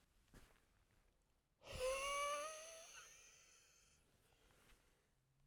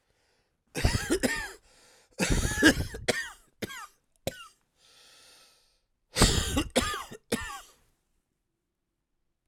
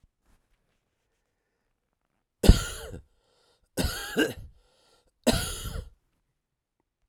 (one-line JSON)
{"exhalation_length": "5.5 s", "exhalation_amplitude": 680, "exhalation_signal_mean_std_ratio": 0.42, "cough_length": "9.5 s", "cough_amplitude": 17305, "cough_signal_mean_std_ratio": 0.39, "three_cough_length": "7.1 s", "three_cough_amplitude": 25846, "three_cough_signal_mean_std_ratio": 0.24, "survey_phase": "alpha (2021-03-01 to 2021-08-12)", "age": "45-64", "gender": "Male", "wearing_mask": "No", "symptom_cough_any": true, "symptom_fatigue": true, "symptom_headache": true, "symptom_change_to_sense_of_smell_or_taste": true, "symptom_onset": "3 days", "smoker_status": "Ex-smoker", "respiratory_condition_asthma": false, "respiratory_condition_other": false, "recruitment_source": "Test and Trace", "submission_delay": "1 day", "covid_test_result": "Positive", "covid_test_method": "RT-qPCR", "covid_ct_value": 15.5, "covid_ct_gene": "ORF1ab gene", "covid_ct_mean": 16.0, "covid_viral_load": "5900000 copies/ml", "covid_viral_load_category": "High viral load (>1M copies/ml)"}